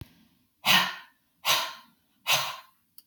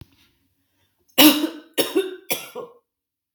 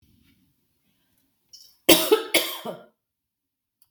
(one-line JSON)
{"exhalation_length": "3.1 s", "exhalation_amplitude": 12916, "exhalation_signal_mean_std_ratio": 0.4, "three_cough_length": "3.3 s", "three_cough_amplitude": 32768, "three_cough_signal_mean_std_ratio": 0.32, "cough_length": "3.9 s", "cough_amplitude": 32768, "cough_signal_mean_std_ratio": 0.26, "survey_phase": "beta (2021-08-13 to 2022-03-07)", "age": "45-64", "gender": "Female", "wearing_mask": "No", "symptom_none": true, "smoker_status": "Ex-smoker", "respiratory_condition_asthma": false, "respiratory_condition_other": false, "recruitment_source": "REACT", "submission_delay": "1 day", "covid_test_result": "Negative", "covid_test_method": "RT-qPCR"}